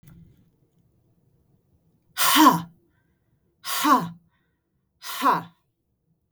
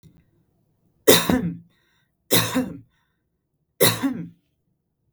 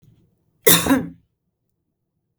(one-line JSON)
{"exhalation_length": "6.3 s", "exhalation_amplitude": 25318, "exhalation_signal_mean_std_ratio": 0.32, "three_cough_length": "5.1 s", "three_cough_amplitude": 32768, "three_cough_signal_mean_std_ratio": 0.34, "cough_length": "2.4 s", "cough_amplitude": 32768, "cough_signal_mean_std_ratio": 0.29, "survey_phase": "beta (2021-08-13 to 2022-03-07)", "age": "45-64", "gender": "Female", "wearing_mask": "No", "symptom_none": true, "smoker_status": "Ex-smoker", "respiratory_condition_asthma": false, "respiratory_condition_other": false, "recruitment_source": "REACT", "submission_delay": "1 day", "covid_test_result": "Negative", "covid_test_method": "RT-qPCR"}